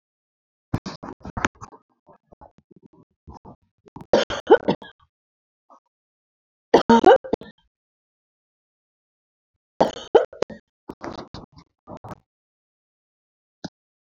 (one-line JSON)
{"cough_length": "14.0 s", "cough_amplitude": 29327, "cough_signal_mean_std_ratio": 0.2, "survey_phase": "beta (2021-08-13 to 2022-03-07)", "age": "65+", "gender": "Female", "wearing_mask": "No", "symptom_none": true, "smoker_status": "Ex-smoker", "respiratory_condition_asthma": false, "respiratory_condition_other": false, "recruitment_source": "REACT", "submission_delay": "4 days", "covid_test_result": "Negative", "covid_test_method": "RT-qPCR"}